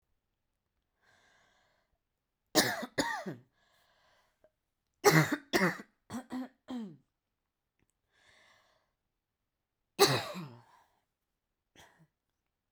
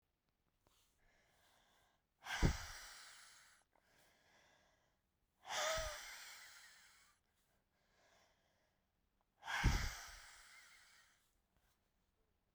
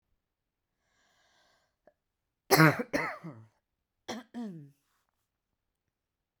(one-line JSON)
{"three_cough_length": "12.7 s", "three_cough_amplitude": 12745, "three_cough_signal_mean_std_ratio": 0.26, "exhalation_length": "12.5 s", "exhalation_amplitude": 2808, "exhalation_signal_mean_std_ratio": 0.29, "cough_length": "6.4 s", "cough_amplitude": 16089, "cough_signal_mean_std_ratio": 0.22, "survey_phase": "beta (2021-08-13 to 2022-03-07)", "age": "18-44", "gender": "Female", "wearing_mask": "No", "symptom_cough_any": true, "symptom_shortness_of_breath": true, "symptom_sore_throat": true, "symptom_diarrhoea": true, "symptom_fatigue": true, "symptom_fever_high_temperature": true, "symptom_headache": true, "symptom_onset": "6 days", "smoker_status": "Never smoked", "respiratory_condition_asthma": false, "respiratory_condition_other": true, "recruitment_source": "Test and Trace", "submission_delay": "2 days", "covid_test_result": "Positive", "covid_test_method": "RT-qPCR"}